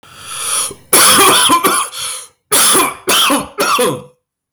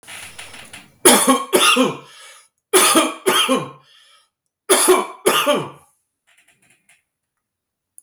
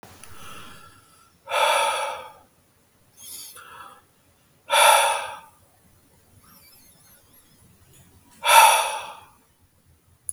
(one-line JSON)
{"cough_length": "4.5 s", "cough_amplitude": 32768, "cough_signal_mean_std_ratio": 0.78, "three_cough_length": "8.0 s", "three_cough_amplitude": 32768, "three_cough_signal_mean_std_ratio": 0.46, "exhalation_length": "10.3 s", "exhalation_amplitude": 32766, "exhalation_signal_mean_std_ratio": 0.34, "survey_phase": "beta (2021-08-13 to 2022-03-07)", "age": "45-64", "gender": "Male", "wearing_mask": "No", "symptom_cough_any": true, "symptom_new_continuous_cough": true, "symptom_runny_or_blocked_nose": true, "symptom_fatigue": true, "symptom_onset": "4 days", "smoker_status": "Never smoked", "respiratory_condition_asthma": false, "respiratory_condition_other": false, "recruitment_source": "Test and Trace", "submission_delay": "2 days", "covid_test_result": "Positive", "covid_test_method": "RT-qPCR", "covid_ct_value": 27.7, "covid_ct_gene": "ORF1ab gene", "covid_ct_mean": 28.4, "covid_viral_load": "480 copies/ml", "covid_viral_load_category": "Minimal viral load (< 10K copies/ml)"}